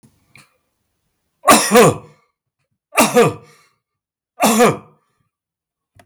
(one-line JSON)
{"three_cough_length": "6.1 s", "three_cough_amplitude": 32768, "three_cough_signal_mean_std_ratio": 0.36, "survey_phase": "beta (2021-08-13 to 2022-03-07)", "age": "65+", "gender": "Male", "wearing_mask": "No", "symptom_none": true, "smoker_status": "Current smoker (e-cigarettes or vapes only)", "respiratory_condition_asthma": false, "respiratory_condition_other": false, "recruitment_source": "REACT", "submission_delay": "3 days", "covid_test_result": "Negative", "covid_test_method": "RT-qPCR", "influenza_a_test_result": "Unknown/Void", "influenza_b_test_result": "Unknown/Void"}